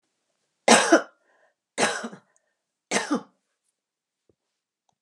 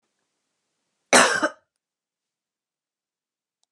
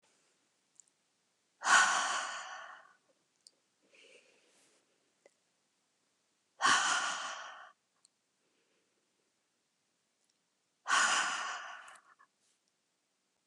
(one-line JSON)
{"three_cough_length": "5.0 s", "three_cough_amplitude": 31398, "three_cough_signal_mean_std_ratio": 0.27, "cough_length": "3.7 s", "cough_amplitude": 30651, "cough_signal_mean_std_ratio": 0.22, "exhalation_length": "13.5 s", "exhalation_amplitude": 7273, "exhalation_signal_mean_std_ratio": 0.32, "survey_phase": "beta (2021-08-13 to 2022-03-07)", "age": "65+", "gender": "Female", "wearing_mask": "No", "symptom_none": true, "smoker_status": "Never smoked", "respiratory_condition_asthma": false, "respiratory_condition_other": false, "recruitment_source": "REACT", "submission_delay": "1 day", "covid_test_result": "Negative", "covid_test_method": "RT-qPCR", "influenza_a_test_result": "Negative", "influenza_b_test_result": "Negative"}